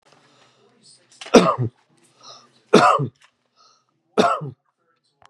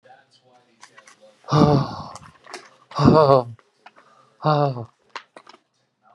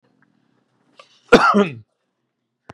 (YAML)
three_cough_length: 5.3 s
three_cough_amplitude: 32768
three_cough_signal_mean_std_ratio: 0.3
exhalation_length: 6.1 s
exhalation_amplitude: 30957
exhalation_signal_mean_std_ratio: 0.35
cough_length: 2.7 s
cough_amplitude: 32768
cough_signal_mean_std_ratio: 0.28
survey_phase: beta (2021-08-13 to 2022-03-07)
age: 65+
gender: Male
wearing_mask: 'No'
symptom_none: true
smoker_status: Never smoked
respiratory_condition_asthma: false
respiratory_condition_other: false
recruitment_source: REACT
submission_delay: 5 days
covid_test_result: Negative
covid_test_method: RT-qPCR
influenza_a_test_result: Negative
influenza_b_test_result: Negative